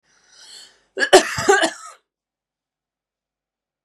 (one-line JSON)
{"cough_length": "3.8 s", "cough_amplitude": 32768, "cough_signal_mean_std_ratio": 0.28, "survey_phase": "beta (2021-08-13 to 2022-03-07)", "age": "18-44", "gender": "Female", "wearing_mask": "No", "symptom_none": true, "symptom_onset": "8 days", "smoker_status": "Never smoked", "respiratory_condition_asthma": false, "respiratory_condition_other": false, "recruitment_source": "REACT", "submission_delay": "3 days", "covid_test_result": "Negative", "covid_test_method": "RT-qPCR", "influenza_a_test_result": "Negative", "influenza_b_test_result": "Negative"}